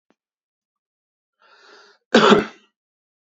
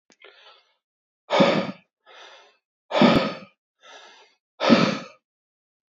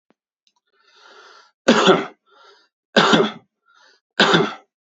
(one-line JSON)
{"cough_length": "3.2 s", "cough_amplitude": 32151, "cough_signal_mean_std_ratio": 0.24, "exhalation_length": "5.9 s", "exhalation_amplitude": 29054, "exhalation_signal_mean_std_ratio": 0.35, "three_cough_length": "4.9 s", "three_cough_amplitude": 29571, "three_cough_signal_mean_std_ratio": 0.37, "survey_phase": "beta (2021-08-13 to 2022-03-07)", "age": "18-44", "gender": "Male", "wearing_mask": "No", "symptom_none": true, "smoker_status": "Current smoker (e-cigarettes or vapes only)", "respiratory_condition_asthma": false, "respiratory_condition_other": false, "recruitment_source": "REACT", "submission_delay": "3 days", "covid_test_result": "Negative", "covid_test_method": "RT-qPCR", "influenza_a_test_result": "Negative", "influenza_b_test_result": "Negative"}